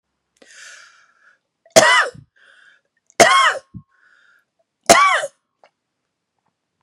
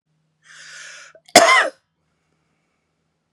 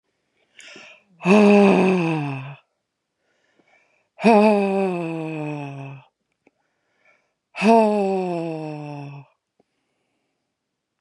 {"three_cough_length": "6.8 s", "three_cough_amplitude": 32768, "three_cough_signal_mean_std_ratio": 0.31, "cough_length": "3.3 s", "cough_amplitude": 32768, "cough_signal_mean_std_ratio": 0.26, "exhalation_length": "11.0 s", "exhalation_amplitude": 25762, "exhalation_signal_mean_std_ratio": 0.42, "survey_phase": "beta (2021-08-13 to 2022-03-07)", "age": "45-64", "gender": "Female", "wearing_mask": "No", "symptom_none": true, "smoker_status": "Never smoked", "respiratory_condition_asthma": false, "respiratory_condition_other": false, "recruitment_source": "REACT", "submission_delay": "2 days", "covid_test_result": "Negative", "covid_test_method": "RT-qPCR", "influenza_a_test_result": "Negative", "influenza_b_test_result": "Negative"}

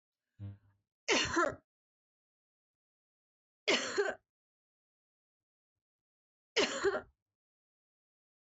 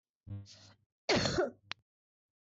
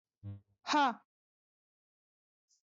{"three_cough_length": "8.4 s", "three_cough_amplitude": 3733, "three_cough_signal_mean_std_ratio": 0.31, "cough_length": "2.5 s", "cough_amplitude": 3758, "cough_signal_mean_std_ratio": 0.38, "exhalation_length": "2.6 s", "exhalation_amplitude": 3471, "exhalation_signal_mean_std_ratio": 0.28, "survey_phase": "beta (2021-08-13 to 2022-03-07)", "age": "45-64", "gender": "Female", "wearing_mask": "No", "symptom_cough_any": true, "symptom_abdominal_pain": true, "symptom_onset": "9 days", "smoker_status": "Never smoked", "respiratory_condition_asthma": false, "respiratory_condition_other": false, "recruitment_source": "REACT", "submission_delay": "1 day", "covid_test_result": "Negative", "covid_test_method": "RT-qPCR", "influenza_a_test_result": "Unknown/Void", "influenza_b_test_result": "Unknown/Void"}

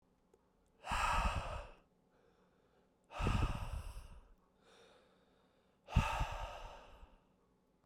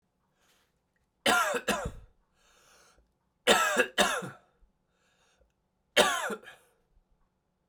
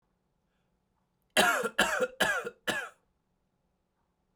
{"exhalation_length": "7.9 s", "exhalation_amplitude": 4581, "exhalation_signal_mean_std_ratio": 0.43, "three_cough_length": "7.7 s", "three_cough_amplitude": 13408, "three_cough_signal_mean_std_ratio": 0.35, "cough_length": "4.4 s", "cough_amplitude": 10979, "cough_signal_mean_std_ratio": 0.38, "survey_phase": "beta (2021-08-13 to 2022-03-07)", "age": "18-44", "gender": "Male", "wearing_mask": "No", "symptom_runny_or_blocked_nose": true, "symptom_fatigue": true, "smoker_status": "Never smoked", "respiratory_condition_asthma": false, "respiratory_condition_other": false, "recruitment_source": "Test and Trace", "submission_delay": "1 day", "covid_test_result": "Positive", "covid_test_method": "ePCR"}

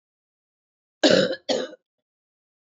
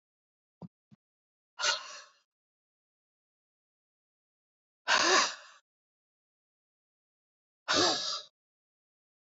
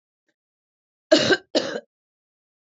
{"cough_length": "2.7 s", "cough_amplitude": 22413, "cough_signal_mean_std_ratio": 0.31, "exhalation_length": "9.2 s", "exhalation_amplitude": 8240, "exhalation_signal_mean_std_ratio": 0.28, "three_cough_length": "2.6 s", "three_cough_amplitude": 23143, "three_cough_signal_mean_std_ratio": 0.29, "survey_phase": "beta (2021-08-13 to 2022-03-07)", "age": "45-64", "gender": "Female", "wearing_mask": "No", "symptom_cough_any": true, "symptom_runny_or_blocked_nose": true, "symptom_shortness_of_breath": true, "symptom_fatigue": true, "symptom_fever_high_temperature": true, "symptom_headache": true, "smoker_status": "Never smoked", "respiratory_condition_asthma": false, "respiratory_condition_other": false, "recruitment_source": "Test and Trace", "submission_delay": "2 days", "covid_test_result": "Positive", "covid_test_method": "LFT"}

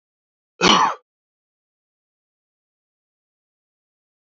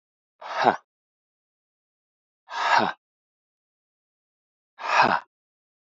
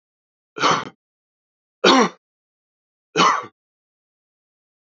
{"cough_length": "4.4 s", "cough_amplitude": 29857, "cough_signal_mean_std_ratio": 0.21, "exhalation_length": "6.0 s", "exhalation_amplitude": 25588, "exhalation_signal_mean_std_ratio": 0.29, "three_cough_length": "4.9 s", "three_cough_amplitude": 29874, "three_cough_signal_mean_std_ratio": 0.3, "survey_phase": "alpha (2021-03-01 to 2021-08-12)", "age": "45-64", "gender": "Male", "wearing_mask": "No", "symptom_none": true, "smoker_status": "Never smoked", "respiratory_condition_asthma": false, "respiratory_condition_other": false, "recruitment_source": "REACT", "submission_delay": "1 day", "covid_test_result": "Negative", "covid_test_method": "RT-qPCR"}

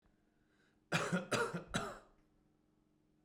{"three_cough_length": "3.2 s", "three_cough_amplitude": 2580, "three_cough_signal_mean_std_ratio": 0.41, "survey_phase": "beta (2021-08-13 to 2022-03-07)", "age": "18-44", "gender": "Male", "wearing_mask": "No", "symptom_cough_any": true, "symptom_runny_or_blocked_nose": true, "symptom_onset": "6 days", "smoker_status": "Never smoked", "respiratory_condition_asthma": true, "respiratory_condition_other": false, "recruitment_source": "REACT", "submission_delay": "1 day", "covid_test_result": "Negative", "covid_test_method": "RT-qPCR", "influenza_a_test_result": "Unknown/Void", "influenza_b_test_result": "Unknown/Void"}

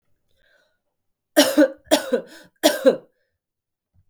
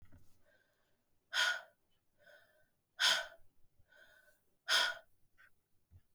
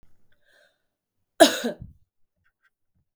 {"three_cough_length": "4.1 s", "three_cough_amplitude": 31360, "three_cough_signal_mean_std_ratio": 0.32, "exhalation_length": "6.1 s", "exhalation_amplitude": 3836, "exhalation_signal_mean_std_ratio": 0.31, "cough_length": "3.2 s", "cough_amplitude": 32766, "cough_signal_mean_std_ratio": 0.19, "survey_phase": "beta (2021-08-13 to 2022-03-07)", "age": "45-64", "gender": "Female", "wearing_mask": "No", "symptom_cough_any": true, "symptom_runny_or_blocked_nose": true, "symptom_sore_throat": true, "symptom_change_to_sense_of_smell_or_taste": true, "symptom_other": true, "symptom_onset": "3 days", "smoker_status": "Never smoked", "respiratory_condition_asthma": false, "respiratory_condition_other": false, "recruitment_source": "Test and Trace", "submission_delay": "1 day", "covid_test_result": "Positive", "covid_test_method": "RT-qPCR"}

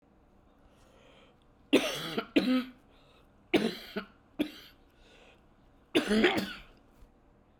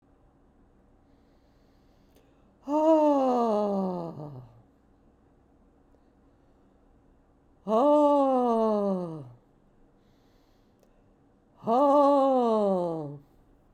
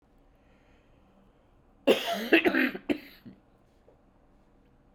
{"three_cough_length": "7.6 s", "three_cough_amplitude": 9064, "three_cough_signal_mean_std_ratio": 0.38, "exhalation_length": "13.7 s", "exhalation_amplitude": 9573, "exhalation_signal_mean_std_ratio": 0.49, "cough_length": "4.9 s", "cough_amplitude": 15957, "cough_signal_mean_std_ratio": 0.32, "survey_phase": "beta (2021-08-13 to 2022-03-07)", "age": "65+", "gender": "Female", "wearing_mask": "No", "symptom_cough_any": true, "symptom_runny_or_blocked_nose": true, "symptom_fatigue": true, "symptom_onset": "3 days", "smoker_status": "Never smoked", "respiratory_condition_asthma": false, "respiratory_condition_other": false, "recruitment_source": "Test and Trace", "submission_delay": "1 day", "covid_test_result": "Positive", "covid_test_method": "RT-qPCR", "covid_ct_value": 18.0, "covid_ct_gene": "ORF1ab gene", "covid_ct_mean": 18.3, "covid_viral_load": "1000000 copies/ml", "covid_viral_load_category": "High viral load (>1M copies/ml)"}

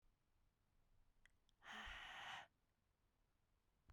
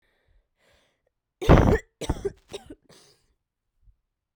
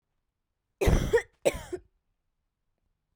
{"exhalation_length": "3.9 s", "exhalation_amplitude": 284, "exhalation_signal_mean_std_ratio": 0.47, "three_cough_length": "4.4 s", "three_cough_amplitude": 29222, "three_cough_signal_mean_std_ratio": 0.25, "cough_length": "3.2 s", "cough_amplitude": 10241, "cough_signal_mean_std_ratio": 0.31, "survey_phase": "beta (2021-08-13 to 2022-03-07)", "age": "18-44", "gender": "Female", "wearing_mask": "No", "symptom_cough_any": true, "symptom_runny_or_blocked_nose": true, "symptom_shortness_of_breath": true, "symptom_abdominal_pain": true, "symptom_diarrhoea": true, "symptom_headache": true, "symptom_other": true, "symptom_onset": "3 days", "smoker_status": "Current smoker (e-cigarettes or vapes only)", "respiratory_condition_asthma": false, "respiratory_condition_other": false, "recruitment_source": "Test and Trace", "submission_delay": "2 days", "covid_test_result": "Positive", "covid_test_method": "RT-qPCR", "covid_ct_value": 14.7, "covid_ct_gene": "N gene"}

